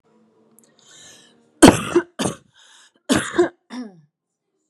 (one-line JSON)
{"cough_length": "4.7 s", "cough_amplitude": 32768, "cough_signal_mean_std_ratio": 0.27, "survey_phase": "beta (2021-08-13 to 2022-03-07)", "age": "18-44", "gender": "Female", "wearing_mask": "No", "symptom_none": true, "smoker_status": "Never smoked", "respiratory_condition_asthma": false, "respiratory_condition_other": false, "recruitment_source": "REACT", "submission_delay": "1 day", "covid_test_result": "Negative", "covid_test_method": "RT-qPCR", "influenza_a_test_result": "Unknown/Void", "influenza_b_test_result": "Unknown/Void"}